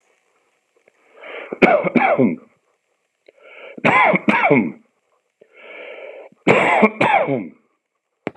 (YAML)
three_cough_length: 8.4 s
three_cough_amplitude: 32768
three_cough_signal_mean_std_ratio: 0.45
survey_phase: beta (2021-08-13 to 2022-03-07)
age: 45-64
gender: Male
wearing_mask: 'No'
symptom_none: true
symptom_onset: 12 days
smoker_status: Never smoked
respiratory_condition_asthma: false
respiratory_condition_other: false
recruitment_source: REACT
submission_delay: 3 days
covid_test_result: Negative
covid_test_method: RT-qPCR
influenza_a_test_result: Negative
influenza_b_test_result: Negative